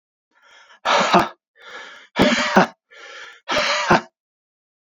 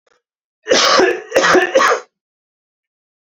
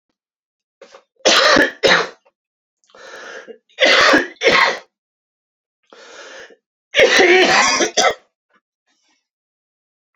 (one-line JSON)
{"exhalation_length": "4.9 s", "exhalation_amplitude": 31428, "exhalation_signal_mean_std_ratio": 0.45, "cough_length": "3.2 s", "cough_amplitude": 32767, "cough_signal_mean_std_ratio": 0.51, "three_cough_length": "10.2 s", "three_cough_amplitude": 32767, "three_cough_signal_mean_std_ratio": 0.43, "survey_phase": "alpha (2021-03-01 to 2021-08-12)", "age": "18-44", "gender": "Male", "wearing_mask": "No", "symptom_new_continuous_cough": true, "symptom_shortness_of_breath": true, "symptom_diarrhoea": true, "symptom_fatigue": true, "symptom_onset": "4 days", "smoker_status": "Never smoked", "respiratory_condition_asthma": false, "respiratory_condition_other": false, "recruitment_source": "Test and Trace", "submission_delay": "2 days", "covid_test_result": "Positive", "covid_test_method": "RT-qPCR", "covid_ct_value": 21.5, "covid_ct_gene": "N gene", "covid_ct_mean": 21.7, "covid_viral_load": "79000 copies/ml", "covid_viral_load_category": "Low viral load (10K-1M copies/ml)"}